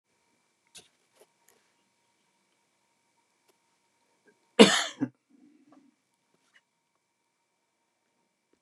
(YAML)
cough_length: 8.6 s
cough_amplitude: 29699
cough_signal_mean_std_ratio: 0.12
survey_phase: beta (2021-08-13 to 2022-03-07)
age: 65+
gender: Male
wearing_mask: 'No'
symptom_none: true
smoker_status: Current smoker (1 to 10 cigarettes per day)
respiratory_condition_asthma: false
respiratory_condition_other: false
recruitment_source: REACT
submission_delay: 2 days
covid_test_result: Negative
covid_test_method: RT-qPCR
influenza_a_test_result: Negative
influenza_b_test_result: Negative